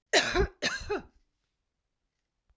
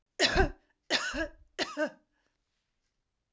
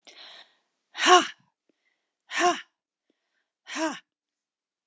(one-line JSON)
{"cough_length": "2.6 s", "cough_amplitude": 9901, "cough_signal_mean_std_ratio": 0.38, "three_cough_length": "3.3 s", "three_cough_amplitude": 8941, "three_cough_signal_mean_std_ratio": 0.39, "exhalation_length": "4.9 s", "exhalation_amplitude": 25252, "exhalation_signal_mean_std_ratio": 0.27, "survey_phase": "alpha (2021-03-01 to 2021-08-12)", "age": "45-64", "gender": "Female", "wearing_mask": "No", "symptom_headache": true, "symptom_onset": "4 days", "smoker_status": "Never smoked", "respiratory_condition_asthma": false, "respiratory_condition_other": false, "recruitment_source": "Test and Trace", "submission_delay": "2 days", "covid_test_result": "Positive", "covid_test_method": "ePCR"}